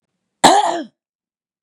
{"cough_length": "1.6 s", "cough_amplitude": 32768, "cough_signal_mean_std_ratio": 0.36, "survey_phase": "beta (2021-08-13 to 2022-03-07)", "age": "45-64", "gender": "Female", "wearing_mask": "Yes", "symptom_runny_or_blocked_nose": true, "symptom_sore_throat": true, "symptom_fatigue": true, "symptom_onset": "7 days", "smoker_status": "Never smoked", "respiratory_condition_asthma": false, "respiratory_condition_other": false, "recruitment_source": "Test and Trace", "submission_delay": "3 days", "covid_test_result": "Negative", "covid_test_method": "RT-qPCR"}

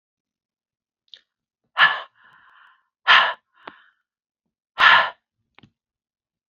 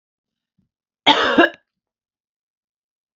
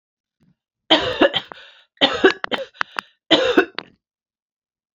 {"exhalation_length": "6.5 s", "exhalation_amplitude": 28078, "exhalation_signal_mean_std_ratio": 0.26, "cough_length": "3.2 s", "cough_amplitude": 30200, "cough_signal_mean_std_ratio": 0.27, "three_cough_length": "4.9 s", "three_cough_amplitude": 32768, "three_cough_signal_mean_std_ratio": 0.35, "survey_phase": "beta (2021-08-13 to 2022-03-07)", "age": "45-64", "gender": "Female", "wearing_mask": "No", "symptom_none": true, "smoker_status": "Never smoked", "respiratory_condition_asthma": false, "respiratory_condition_other": false, "recruitment_source": "Test and Trace", "submission_delay": "2 days", "covid_test_result": "Negative", "covid_test_method": "RT-qPCR"}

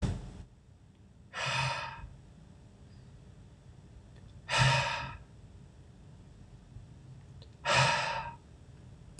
{"exhalation_length": "9.2 s", "exhalation_amplitude": 7489, "exhalation_signal_mean_std_ratio": 0.46, "survey_phase": "beta (2021-08-13 to 2022-03-07)", "age": "18-44", "gender": "Male", "wearing_mask": "No", "symptom_cough_any": true, "symptom_runny_or_blocked_nose": true, "symptom_sore_throat": true, "symptom_fatigue": true, "symptom_headache": true, "symptom_change_to_sense_of_smell_or_taste": true, "smoker_status": "Never smoked", "respiratory_condition_asthma": false, "respiratory_condition_other": false, "recruitment_source": "Test and Trace", "submission_delay": "2 days", "covid_test_result": "Positive", "covid_test_method": "LFT"}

